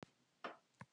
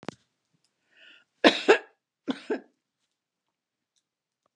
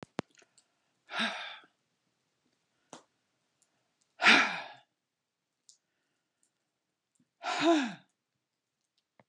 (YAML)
three_cough_length: 0.9 s
three_cough_amplitude: 589
three_cough_signal_mean_std_ratio: 0.35
cough_length: 4.6 s
cough_amplitude: 23161
cough_signal_mean_std_ratio: 0.2
exhalation_length: 9.3 s
exhalation_amplitude: 12704
exhalation_signal_mean_std_ratio: 0.25
survey_phase: beta (2021-08-13 to 2022-03-07)
age: 65+
gender: Female
wearing_mask: 'No'
symptom_none: true
smoker_status: Never smoked
respiratory_condition_asthma: false
respiratory_condition_other: false
recruitment_source: REACT
submission_delay: 1 day
covid_test_result: Negative
covid_test_method: RT-qPCR